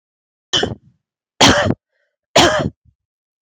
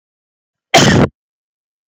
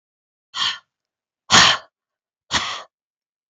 {
  "three_cough_length": "3.4 s",
  "three_cough_amplitude": 32768,
  "three_cough_signal_mean_std_ratio": 0.38,
  "cough_length": "1.9 s",
  "cough_amplitude": 32768,
  "cough_signal_mean_std_ratio": 0.36,
  "exhalation_length": "3.5 s",
  "exhalation_amplitude": 32768,
  "exhalation_signal_mean_std_ratio": 0.3,
  "survey_phase": "beta (2021-08-13 to 2022-03-07)",
  "age": "45-64",
  "gender": "Female",
  "wearing_mask": "No",
  "symptom_none": true,
  "smoker_status": "Never smoked",
  "respiratory_condition_asthma": true,
  "respiratory_condition_other": false,
  "recruitment_source": "REACT",
  "submission_delay": "1 day",
  "covid_test_result": "Negative",
  "covid_test_method": "RT-qPCR",
  "influenza_a_test_result": "Negative",
  "influenza_b_test_result": "Negative"
}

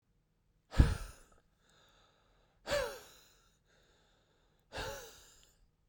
{
  "exhalation_length": "5.9 s",
  "exhalation_amplitude": 9884,
  "exhalation_signal_mean_std_ratio": 0.24,
  "survey_phase": "beta (2021-08-13 to 2022-03-07)",
  "age": "18-44",
  "gender": "Male",
  "wearing_mask": "No",
  "symptom_none": true,
  "symptom_onset": "9 days",
  "smoker_status": "Never smoked",
  "recruitment_source": "REACT",
  "submission_delay": "2 days",
  "covid_test_result": "Negative",
  "covid_test_method": "RT-qPCR",
  "influenza_a_test_result": "Negative",
  "influenza_b_test_result": "Negative"
}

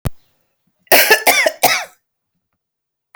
{
  "cough_length": "3.2 s",
  "cough_amplitude": 32768,
  "cough_signal_mean_std_ratio": 0.39,
  "survey_phase": "alpha (2021-03-01 to 2021-08-12)",
  "age": "45-64",
  "gender": "Female",
  "wearing_mask": "No",
  "symptom_none": true,
  "smoker_status": "Ex-smoker",
  "respiratory_condition_asthma": false,
  "respiratory_condition_other": false,
  "recruitment_source": "REACT",
  "submission_delay": "1 day",
  "covid_test_result": "Negative",
  "covid_test_method": "RT-qPCR"
}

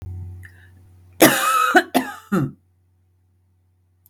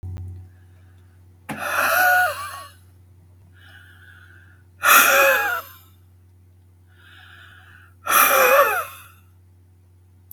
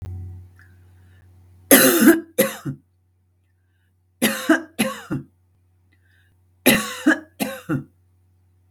{
  "cough_length": "4.1 s",
  "cough_amplitude": 32768,
  "cough_signal_mean_std_ratio": 0.39,
  "exhalation_length": "10.3 s",
  "exhalation_amplitude": 31081,
  "exhalation_signal_mean_std_ratio": 0.43,
  "three_cough_length": "8.7 s",
  "three_cough_amplitude": 32768,
  "three_cough_signal_mean_std_ratio": 0.36,
  "survey_phase": "beta (2021-08-13 to 2022-03-07)",
  "age": "45-64",
  "gender": "Female",
  "wearing_mask": "No",
  "symptom_none": true,
  "smoker_status": "Never smoked",
  "respiratory_condition_asthma": false,
  "respiratory_condition_other": false,
  "recruitment_source": "REACT",
  "submission_delay": "3 days",
  "covid_test_result": "Negative",
  "covid_test_method": "RT-qPCR",
  "influenza_a_test_result": "Negative",
  "influenza_b_test_result": "Negative"
}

